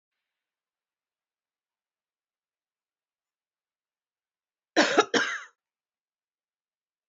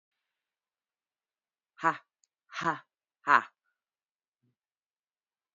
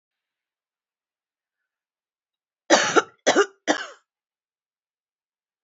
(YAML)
cough_length: 7.1 s
cough_amplitude: 15428
cough_signal_mean_std_ratio: 0.19
exhalation_length: 5.5 s
exhalation_amplitude: 14346
exhalation_signal_mean_std_ratio: 0.18
three_cough_length: 5.6 s
three_cough_amplitude: 25050
three_cough_signal_mean_std_ratio: 0.24
survey_phase: beta (2021-08-13 to 2022-03-07)
age: 45-64
gender: Female
wearing_mask: 'No'
symptom_sore_throat: true
symptom_fatigue: true
symptom_headache: true
symptom_onset: 11 days
smoker_status: Current smoker (1 to 10 cigarettes per day)
respiratory_condition_asthma: false
respiratory_condition_other: false
recruitment_source: REACT
submission_delay: 0 days
covid_test_result: Negative
covid_test_method: RT-qPCR
influenza_a_test_result: Negative
influenza_b_test_result: Negative